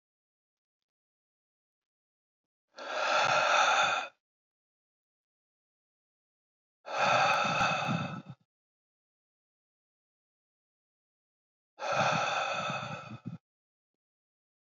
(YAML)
exhalation_length: 14.7 s
exhalation_amplitude: 6713
exhalation_signal_mean_std_ratio: 0.41
survey_phase: beta (2021-08-13 to 2022-03-07)
age: 45-64
gender: Male
wearing_mask: 'No'
symptom_none: true
smoker_status: Never smoked
respiratory_condition_asthma: false
respiratory_condition_other: false
recruitment_source: REACT
submission_delay: 1 day
covid_test_result: Negative
covid_test_method: RT-qPCR
influenza_a_test_result: Negative
influenza_b_test_result: Negative